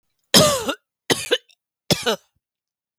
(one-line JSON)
{"three_cough_length": "3.0 s", "three_cough_amplitude": 32768, "three_cough_signal_mean_std_ratio": 0.36, "survey_phase": "beta (2021-08-13 to 2022-03-07)", "age": "18-44", "gender": "Female", "wearing_mask": "No", "symptom_fatigue": true, "symptom_onset": "13 days", "smoker_status": "Ex-smoker", "respiratory_condition_asthma": false, "respiratory_condition_other": false, "recruitment_source": "REACT", "submission_delay": "2 days", "covid_test_result": "Negative", "covid_test_method": "RT-qPCR", "influenza_a_test_result": "Negative", "influenza_b_test_result": "Negative"}